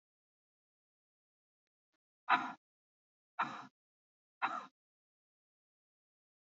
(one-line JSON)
{"exhalation_length": "6.5 s", "exhalation_amplitude": 5959, "exhalation_signal_mean_std_ratio": 0.2, "survey_phase": "beta (2021-08-13 to 2022-03-07)", "age": "18-44", "gender": "Female", "wearing_mask": "No", "symptom_none": true, "smoker_status": "Never smoked", "respiratory_condition_asthma": false, "respiratory_condition_other": false, "recruitment_source": "REACT", "submission_delay": "1 day", "covid_test_result": "Negative", "covid_test_method": "RT-qPCR", "influenza_a_test_result": "Negative", "influenza_b_test_result": "Negative"}